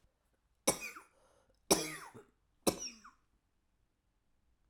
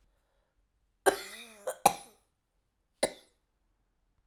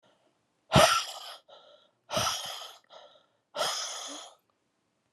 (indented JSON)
{
  "three_cough_length": "4.7 s",
  "three_cough_amplitude": 6918,
  "three_cough_signal_mean_std_ratio": 0.24,
  "cough_length": "4.3 s",
  "cough_amplitude": 15977,
  "cough_signal_mean_std_ratio": 0.19,
  "exhalation_length": "5.1 s",
  "exhalation_amplitude": 15277,
  "exhalation_signal_mean_std_ratio": 0.35,
  "survey_phase": "alpha (2021-03-01 to 2021-08-12)",
  "age": "18-44",
  "gender": "Female",
  "wearing_mask": "No",
  "symptom_cough_any": true,
  "symptom_new_continuous_cough": true,
  "symptom_shortness_of_breath": true,
  "symptom_abdominal_pain": true,
  "symptom_fatigue": true,
  "symptom_headache": true,
  "symptom_onset": "4 days",
  "smoker_status": "Never smoked",
  "respiratory_condition_asthma": true,
  "respiratory_condition_other": false,
  "recruitment_source": "Test and Trace",
  "submission_delay": "2 days",
  "covid_test_result": "Positive",
  "covid_test_method": "RT-qPCR"
}